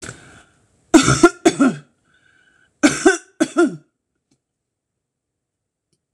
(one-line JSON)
{"cough_length": "6.1 s", "cough_amplitude": 26028, "cough_signal_mean_std_ratio": 0.32, "survey_phase": "beta (2021-08-13 to 2022-03-07)", "age": "45-64", "gender": "Female", "wearing_mask": "No", "symptom_none": true, "smoker_status": "Never smoked", "respiratory_condition_asthma": false, "respiratory_condition_other": false, "recruitment_source": "REACT", "submission_delay": "1 day", "covid_test_result": "Negative", "covid_test_method": "RT-qPCR"}